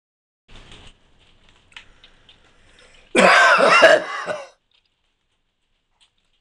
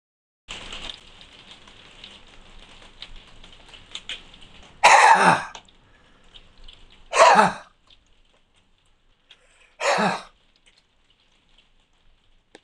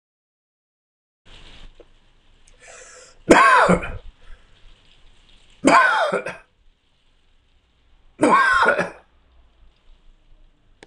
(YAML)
cough_length: 6.4 s
cough_amplitude: 26028
cough_signal_mean_std_ratio: 0.34
exhalation_length: 12.6 s
exhalation_amplitude: 26028
exhalation_signal_mean_std_ratio: 0.29
three_cough_length: 10.9 s
three_cough_amplitude: 26028
three_cough_signal_mean_std_ratio: 0.35
survey_phase: beta (2021-08-13 to 2022-03-07)
age: 65+
gender: Male
wearing_mask: 'No'
symptom_none: true
smoker_status: Never smoked
respiratory_condition_asthma: true
respiratory_condition_other: false
recruitment_source: REACT
submission_delay: 2 days
covid_test_result: Negative
covid_test_method: RT-qPCR